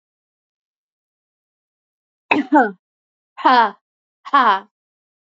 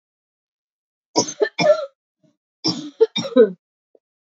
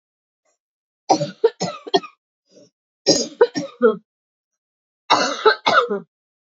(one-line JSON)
{"exhalation_length": "5.4 s", "exhalation_amplitude": 28451, "exhalation_signal_mean_std_ratio": 0.3, "cough_length": "4.3 s", "cough_amplitude": 26298, "cough_signal_mean_std_ratio": 0.34, "three_cough_length": "6.5 s", "three_cough_amplitude": 30399, "three_cough_signal_mean_std_ratio": 0.37, "survey_phase": "beta (2021-08-13 to 2022-03-07)", "age": "45-64", "gender": "Female", "wearing_mask": "No", "symptom_new_continuous_cough": true, "symptom_runny_or_blocked_nose": true, "symptom_shortness_of_breath": true, "symptom_sore_throat": true, "symptom_fatigue": true, "symptom_other": true, "symptom_onset": "2 days", "smoker_status": "Never smoked", "respiratory_condition_asthma": true, "respiratory_condition_other": false, "recruitment_source": "Test and Trace", "submission_delay": "1 day", "covid_test_result": "Positive", "covid_test_method": "RT-qPCR", "covid_ct_value": 17.0, "covid_ct_gene": "ORF1ab gene", "covid_ct_mean": 17.4, "covid_viral_load": "1900000 copies/ml", "covid_viral_load_category": "High viral load (>1M copies/ml)"}